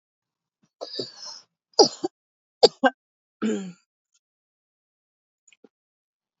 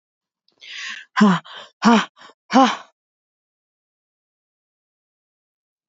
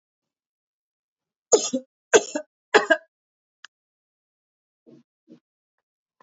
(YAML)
cough_length: 6.4 s
cough_amplitude: 28719
cough_signal_mean_std_ratio: 0.2
exhalation_length: 5.9 s
exhalation_amplitude: 26546
exhalation_signal_mean_std_ratio: 0.28
three_cough_length: 6.2 s
three_cough_amplitude: 25322
three_cough_signal_mean_std_ratio: 0.19
survey_phase: beta (2021-08-13 to 2022-03-07)
age: 18-44
gender: Female
wearing_mask: 'No'
symptom_diarrhoea: true
symptom_fatigue: true
symptom_loss_of_taste: true
symptom_onset: 5 days
smoker_status: Never smoked
respiratory_condition_asthma: false
respiratory_condition_other: false
recruitment_source: REACT
submission_delay: 4 days
covid_test_result: Positive
covid_test_method: RT-qPCR
covid_ct_value: 23.0
covid_ct_gene: E gene
influenza_a_test_result: Negative
influenza_b_test_result: Negative